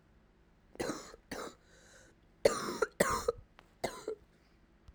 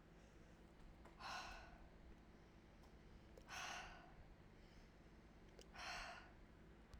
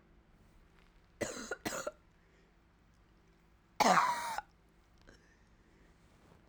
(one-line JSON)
{"cough_length": "4.9 s", "cough_amplitude": 9763, "cough_signal_mean_std_ratio": 0.35, "exhalation_length": "7.0 s", "exhalation_amplitude": 335, "exhalation_signal_mean_std_ratio": 0.85, "three_cough_length": "6.5 s", "three_cough_amplitude": 7367, "three_cough_signal_mean_std_ratio": 0.3, "survey_phase": "alpha (2021-03-01 to 2021-08-12)", "age": "18-44", "gender": "Female", "wearing_mask": "No", "symptom_cough_any": true, "symptom_new_continuous_cough": true, "symptom_shortness_of_breath": true, "symptom_fatigue": true, "symptom_fever_high_temperature": true, "symptom_headache": true, "symptom_change_to_sense_of_smell_or_taste": true, "symptom_onset": "3 days", "smoker_status": "Never smoked", "respiratory_condition_asthma": false, "respiratory_condition_other": false, "recruitment_source": "Test and Trace", "submission_delay": "2 days", "covid_test_result": "Positive", "covid_test_method": "RT-qPCR", "covid_ct_value": 14.2, "covid_ct_gene": "ORF1ab gene", "covid_ct_mean": 15.0, "covid_viral_load": "12000000 copies/ml", "covid_viral_load_category": "High viral load (>1M copies/ml)"}